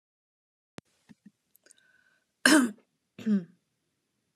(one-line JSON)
{"cough_length": "4.4 s", "cough_amplitude": 19599, "cough_signal_mean_std_ratio": 0.25, "survey_phase": "beta (2021-08-13 to 2022-03-07)", "age": "45-64", "gender": "Female", "wearing_mask": "No", "symptom_cough_any": true, "smoker_status": "Never smoked", "respiratory_condition_asthma": false, "respiratory_condition_other": false, "recruitment_source": "REACT", "submission_delay": "2 days", "covid_test_result": "Negative", "covid_test_method": "RT-qPCR"}